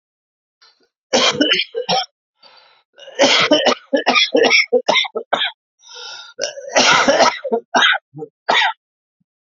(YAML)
three_cough_length: 9.6 s
three_cough_amplitude: 31250
three_cough_signal_mean_std_ratio: 0.54
survey_phase: alpha (2021-03-01 to 2021-08-12)
age: 45-64
gender: Male
wearing_mask: 'No'
symptom_new_continuous_cough: true
symptom_fatigue: true
symptom_headache: true
symptom_loss_of_taste: true
symptom_onset: 4 days
smoker_status: Never smoked
respiratory_condition_asthma: false
respiratory_condition_other: false
recruitment_source: Test and Trace
submission_delay: 1 day
covid_test_result: Positive
covid_test_method: RT-qPCR
covid_ct_value: 15.4
covid_ct_gene: ORF1ab gene
covid_ct_mean: 16.6
covid_viral_load: 3600000 copies/ml
covid_viral_load_category: High viral load (>1M copies/ml)